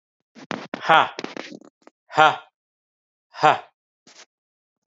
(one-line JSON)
{"exhalation_length": "4.9 s", "exhalation_amplitude": 32437, "exhalation_signal_mean_std_ratio": 0.27, "survey_phase": "alpha (2021-03-01 to 2021-08-12)", "age": "65+", "gender": "Male", "wearing_mask": "No", "symptom_none": true, "smoker_status": "Never smoked", "respiratory_condition_asthma": false, "respiratory_condition_other": false, "recruitment_source": "REACT", "submission_delay": "3 days", "covid_test_result": "Negative", "covid_test_method": "RT-qPCR"}